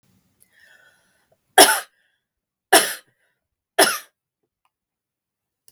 three_cough_length: 5.7 s
three_cough_amplitude: 32768
three_cough_signal_mean_std_ratio: 0.22
survey_phase: beta (2021-08-13 to 2022-03-07)
age: 65+
gender: Female
wearing_mask: 'No'
symptom_none: true
smoker_status: Never smoked
respiratory_condition_asthma: false
respiratory_condition_other: false
recruitment_source: REACT
submission_delay: 2 days
covid_test_result: Negative
covid_test_method: RT-qPCR
influenza_a_test_result: Negative
influenza_b_test_result: Negative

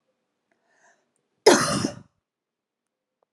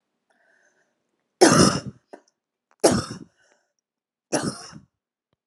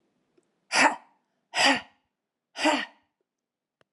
cough_length: 3.3 s
cough_amplitude: 26543
cough_signal_mean_std_ratio: 0.24
three_cough_length: 5.5 s
three_cough_amplitude: 29964
three_cough_signal_mean_std_ratio: 0.28
exhalation_length: 3.9 s
exhalation_amplitude: 14710
exhalation_signal_mean_std_ratio: 0.33
survey_phase: beta (2021-08-13 to 2022-03-07)
age: 45-64
gender: Female
wearing_mask: 'No'
symptom_cough_any: true
symptom_fatigue: true
symptom_headache: true
symptom_other: true
smoker_status: Never smoked
respiratory_condition_asthma: false
respiratory_condition_other: false
recruitment_source: Test and Trace
submission_delay: 2 days
covid_test_result: Positive
covid_test_method: RT-qPCR
covid_ct_value: 28.8
covid_ct_gene: ORF1ab gene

